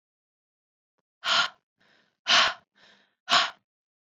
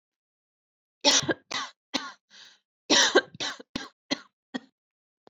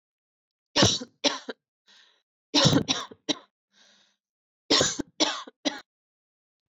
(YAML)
exhalation_length: 4.0 s
exhalation_amplitude: 15091
exhalation_signal_mean_std_ratio: 0.32
cough_length: 5.3 s
cough_amplitude: 15983
cough_signal_mean_std_ratio: 0.32
three_cough_length: 6.7 s
three_cough_amplitude: 15173
three_cough_signal_mean_std_ratio: 0.34
survey_phase: alpha (2021-03-01 to 2021-08-12)
age: 18-44
gender: Female
wearing_mask: 'No'
symptom_cough_any: true
symptom_abdominal_pain: true
symptom_onset: 2 days
smoker_status: Ex-smoker
respiratory_condition_asthma: false
respiratory_condition_other: false
recruitment_source: Test and Trace
submission_delay: 2 days
covid_test_result: Positive
covid_test_method: RT-qPCR